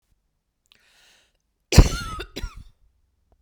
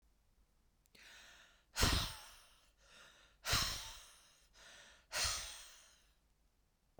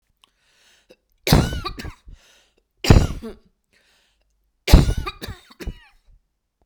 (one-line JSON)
{"cough_length": "3.4 s", "cough_amplitude": 32768, "cough_signal_mean_std_ratio": 0.2, "exhalation_length": "7.0 s", "exhalation_amplitude": 3857, "exhalation_signal_mean_std_ratio": 0.37, "three_cough_length": "6.7 s", "three_cough_amplitude": 32768, "three_cough_signal_mean_std_ratio": 0.28, "survey_phase": "beta (2021-08-13 to 2022-03-07)", "age": "45-64", "gender": "Female", "wearing_mask": "No", "symptom_cough_any": true, "smoker_status": "Never smoked", "respiratory_condition_asthma": false, "respiratory_condition_other": false, "recruitment_source": "REACT", "submission_delay": "2 days", "covid_test_result": "Negative", "covid_test_method": "RT-qPCR", "influenza_a_test_result": "Negative", "influenza_b_test_result": "Negative"}